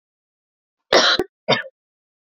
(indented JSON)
{
  "cough_length": "2.4 s",
  "cough_amplitude": 30178,
  "cough_signal_mean_std_ratio": 0.32,
  "survey_phase": "beta (2021-08-13 to 2022-03-07)",
  "age": "18-44",
  "gender": "Female",
  "wearing_mask": "Yes",
  "symptom_cough_any": true,
  "symptom_new_continuous_cough": true,
  "symptom_runny_or_blocked_nose": true,
  "symptom_shortness_of_breath": true,
  "symptom_sore_throat": true,
  "symptom_abdominal_pain": true,
  "symptom_diarrhoea": true,
  "symptom_fatigue": true,
  "symptom_headache": true,
  "symptom_change_to_sense_of_smell_or_taste": true,
  "symptom_loss_of_taste": true,
  "symptom_onset": "3 days",
  "smoker_status": "Ex-smoker",
  "respiratory_condition_asthma": false,
  "respiratory_condition_other": false,
  "recruitment_source": "Test and Trace",
  "submission_delay": "1 day",
  "covid_test_result": "Positive",
  "covid_test_method": "RT-qPCR",
  "covid_ct_value": 18.6,
  "covid_ct_gene": "ORF1ab gene",
  "covid_ct_mean": 19.4,
  "covid_viral_load": "440000 copies/ml",
  "covid_viral_load_category": "Low viral load (10K-1M copies/ml)"
}